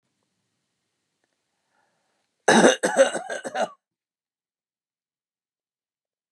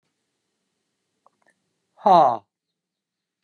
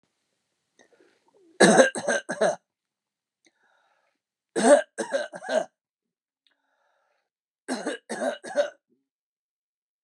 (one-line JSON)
{"cough_length": "6.3 s", "cough_amplitude": 27869, "cough_signal_mean_std_ratio": 0.26, "exhalation_length": "3.4 s", "exhalation_amplitude": 25005, "exhalation_signal_mean_std_ratio": 0.23, "three_cough_length": "10.0 s", "three_cough_amplitude": 26796, "three_cough_signal_mean_std_ratio": 0.3, "survey_phase": "beta (2021-08-13 to 2022-03-07)", "age": "45-64", "gender": "Male", "wearing_mask": "No", "symptom_new_continuous_cough": true, "symptom_runny_or_blocked_nose": true, "symptom_sore_throat": true, "symptom_fatigue": true, "symptom_onset": "13 days", "smoker_status": "Never smoked", "respiratory_condition_asthma": false, "respiratory_condition_other": false, "recruitment_source": "REACT", "submission_delay": "2 days", "covid_test_result": "Positive", "covid_test_method": "RT-qPCR", "covid_ct_value": 17.8, "covid_ct_gene": "E gene", "influenza_a_test_result": "Negative", "influenza_b_test_result": "Negative"}